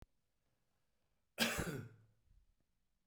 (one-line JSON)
{"cough_length": "3.1 s", "cough_amplitude": 3186, "cough_signal_mean_std_ratio": 0.31, "survey_phase": "beta (2021-08-13 to 2022-03-07)", "age": "45-64", "gender": "Male", "wearing_mask": "No", "symptom_cough_any": true, "smoker_status": "Never smoked", "respiratory_condition_asthma": false, "respiratory_condition_other": false, "recruitment_source": "REACT", "submission_delay": "0 days", "covid_test_result": "Negative", "covid_test_method": "RT-qPCR"}